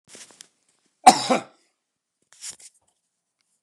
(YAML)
cough_length: 3.6 s
cough_amplitude: 29204
cough_signal_mean_std_ratio: 0.18
survey_phase: beta (2021-08-13 to 2022-03-07)
age: 65+
gender: Male
wearing_mask: 'No'
symptom_none: true
smoker_status: Ex-smoker
respiratory_condition_asthma: false
respiratory_condition_other: false
recruitment_source: REACT
submission_delay: 4 days
covid_test_result: Negative
covid_test_method: RT-qPCR
influenza_a_test_result: Negative
influenza_b_test_result: Negative